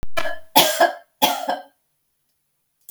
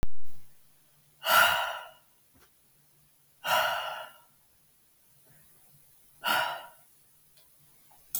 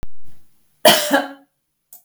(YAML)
three_cough_length: 2.9 s
three_cough_amplitude: 32768
three_cough_signal_mean_std_ratio: 0.5
exhalation_length: 8.2 s
exhalation_amplitude: 10487
exhalation_signal_mean_std_ratio: 0.4
cough_length: 2.0 s
cough_amplitude: 32768
cough_signal_mean_std_ratio: 0.5
survey_phase: beta (2021-08-13 to 2022-03-07)
age: 18-44
gender: Female
wearing_mask: 'No'
symptom_none: true
smoker_status: Ex-smoker
respiratory_condition_asthma: false
respiratory_condition_other: false
recruitment_source: REACT
submission_delay: 1 day
covid_test_result: Negative
covid_test_method: RT-qPCR